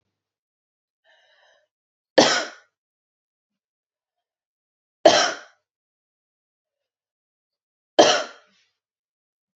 {"three_cough_length": "9.6 s", "three_cough_amplitude": 29939, "three_cough_signal_mean_std_ratio": 0.2, "survey_phase": "beta (2021-08-13 to 2022-03-07)", "age": "18-44", "gender": "Female", "wearing_mask": "No", "symptom_none": true, "smoker_status": "Never smoked", "respiratory_condition_asthma": false, "respiratory_condition_other": false, "recruitment_source": "REACT", "submission_delay": "1 day", "covid_test_result": "Negative", "covid_test_method": "RT-qPCR", "influenza_a_test_result": "Unknown/Void", "influenza_b_test_result": "Unknown/Void"}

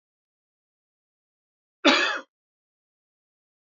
{"cough_length": "3.7 s", "cough_amplitude": 19835, "cough_signal_mean_std_ratio": 0.22, "survey_phase": "beta (2021-08-13 to 2022-03-07)", "age": "18-44", "gender": "Male", "wearing_mask": "No", "symptom_cough_any": true, "symptom_runny_or_blocked_nose": true, "symptom_shortness_of_breath": true, "symptom_fatigue": true, "symptom_headache": true, "symptom_change_to_sense_of_smell_or_taste": true, "symptom_loss_of_taste": true, "symptom_other": true, "symptom_onset": "6 days", "smoker_status": "Ex-smoker", "respiratory_condition_asthma": false, "respiratory_condition_other": false, "recruitment_source": "Test and Trace", "submission_delay": "2 days", "covid_test_result": "Positive", "covid_test_method": "RT-qPCR"}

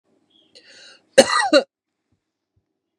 {"cough_length": "3.0 s", "cough_amplitude": 32768, "cough_signal_mean_std_ratio": 0.25, "survey_phase": "beta (2021-08-13 to 2022-03-07)", "age": "45-64", "gender": "Female", "wearing_mask": "No", "symptom_none": true, "smoker_status": "Ex-smoker", "respiratory_condition_asthma": false, "respiratory_condition_other": false, "recruitment_source": "REACT", "submission_delay": "2 days", "covid_test_result": "Negative", "covid_test_method": "RT-qPCR", "influenza_a_test_result": "Negative", "influenza_b_test_result": "Negative"}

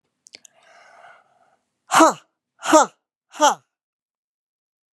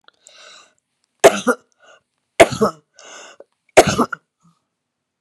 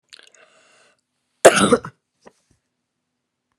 {"exhalation_length": "4.9 s", "exhalation_amplitude": 32680, "exhalation_signal_mean_std_ratio": 0.25, "three_cough_length": "5.2 s", "three_cough_amplitude": 32768, "three_cough_signal_mean_std_ratio": 0.25, "cough_length": "3.6 s", "cough_amplitude": 32768, "cough_signal_mean_std_ratio": 0.21, "survey_phase": "beta (2021-08-13 to 2022-03-07)", "age": "65+", "gender": "Female", "wearing_mask": "No", "symptom_cough_any": true, "symptom_onset": "8 days", "smoker_status": "Never smoked", "respiratory_condition_asthma": false, "respiratory_condition_other": false, "recruitment_source": "REACT", "submission_delay": "1 day", "covid_test_method": "RT-qPCR", "influenza_a_test_result": "Unknown/Void", "influenza_b_test_result": "Unknown/Void"}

